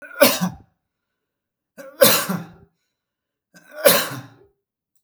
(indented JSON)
{
  "three_cough_length": "5.0 s",
  "three_cough_amplitude": 32768,
  "three_cough_signal_mean_std_ratio": 0.32,
  "survey_phase": "beta (2021-08-13 to 2022-03-07)",
  "age": "45-64",
  "gender": "Male",
  "wearing_mask": "No",
  "symptom_none": true,
  "smoker_status": "Never smoked",
  "respiratory_condition_asthma": false,
  "respiratory_condition_other": false,
  "recruitment_source": "REACT",
  "submission_delay": "2 days",
  "covid_test_result": "Negative",
  "covid_test_method": "RT-qPCR",
  "influenza_a_test_result": "Negative",
  "influenza_b_test_result": "Negative"
}